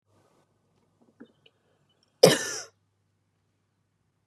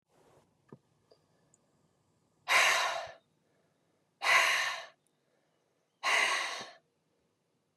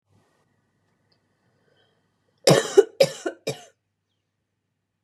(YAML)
cough_length: 4.3 s
cough_amplitude: 28110
cough_signal_mean_std_ratio: 0.16
exhalation_length: 7.8 s
exhalation_amplitude: 7557
exhalation_signal_mean_std_ratio: 0.37
three_cough_length: 5.0 s
three_cough_amplitude: 27710
three_cough_signal_mean_std_ratio: 0.21
survey_phase: beta (2021-08-13 to 2022-03-07)
age: 18-44
gender: Female
wearing_mask: 'No'
symptom_none: true
smoker_status: Never smoked
respiratory_condition_asthma: true
respiratory_condition_other: false
recruitment_source: Test and Trace
submission_delay: 0 days
covid_test_result: Negative
covid_test_method: LFT